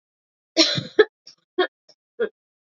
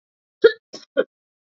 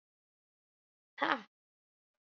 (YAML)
three_cough_length: 2.6 s
three_cough_amplitude: 27557
three_cough_signal_mean_std_ratio: 0.3
cough_length: 1.5 s
cough_amplitude: 27509
cough_signal_mean_std_ratio: 0.22
exhalation_length: 2.4 s
exhalation_amplitude: 7658
exhalation_signal_mean_std_ratio: 0.18
survey_phase: alpha (2021-03-01 to 2021-08-12)
age: 18-44
gender: Female
wearing_mask: 'No'
symptom_cough_any: true
symptom_shortness_of_breath: true
symptom_fatigue: true
symptom_fever_high_temperature: true
symptom_headache: true
symptom_onset: 2 days
smoker_status: Never smoked
respiratory_condition_asthma: false
respiratory_condition_other: false
recruitment_source: Test and Trace
submission_delay: 1 day
covid_test_result: Positive
covid_test_method: RT-qPCR
covid_ct_value: 17.5
covid_ct_gene: ORF1ab gene
covid_ct_mean: 17.9
covid_viral_load: 1400000 copies/ml
covid_viral_load_category: High viral load (>1M copies/ml)